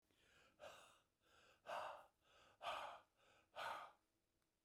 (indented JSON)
{
  "exhalation_length": "4.6 s",
  "exhalation_amplitude": 455,
  "exhalation_signal_mean_std_ratio": 0.46,
  "survey_phase": "beta (2021-08-13 to 2022-03-07)",
  "age": "45-64",
  "gender": "Male",
  "wearing_mask": "No",
  "symptom_cough_any": true,
  "symptom_shortness_of_breath": true,
  "symptom_fatigue": true,
  "symptom_change_to_sense_of_smell_or_taste": true,
  "symptom_loss_of_taste": true,
  "symptom_onset": "6 days",
  "smoker_status": "Never smoked",
  "respiratory_condition_asthma": false,
  "respiratory_condition_other": false,
  "recruitment_source": "Test and Trace",
  "submission_delay": "2 days",
  "covid_test_result": "Positive",
  "covid_test_method": "RT-qPCR"
}